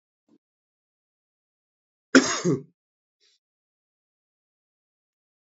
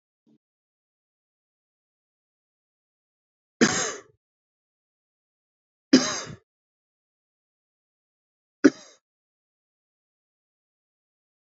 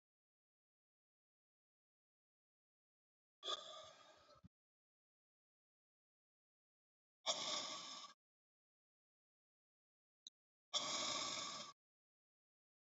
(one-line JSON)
{"cough_length": "5.5 s", "cough_amplitude": 27191, "cough_signal_mean_std_ratio": 0.17, "three_cough_length": "11.4 s", "three_cough_amplitude": 26291, "three_cough_signal_mean_std_ratio": 0.15, "exhalation_length": "13.0 s", "exhalation_amplitude": 1606, "exhalation_signal_mean_std_ratio": 0.31, "survey_phase": "beta (2021-08-13 to 2022-03-07)", "age": "18-44", "gender": "Male", "wearing_mask": "No", "symptom_cough_any": true, "symptom_new_continuous_cough": true, "symptom_fatigue": true, "symptom_headache": true, "symptom_change_to_sense_of_smell_or_taste": true, "symptom_onset": "6 days", "smoker_status": "Never smoked", "respiratory_condition_asthma": false, "respiratory_condition_other": false, "recruitment_source": "Test and Trace", "submission_delay": "2 days", "covid_test_result": "Positive", "covid_test_method": "RT-qPCR", "covid_ct_value": 20.6, "covid_ct_gene": "ORF1ab gene", "covid_ct_mean": 21.7, "covid_viral_load": "78000 copies/ml", "covid_viral_load_category": "Low viral load (10K-1M copies/ml)"}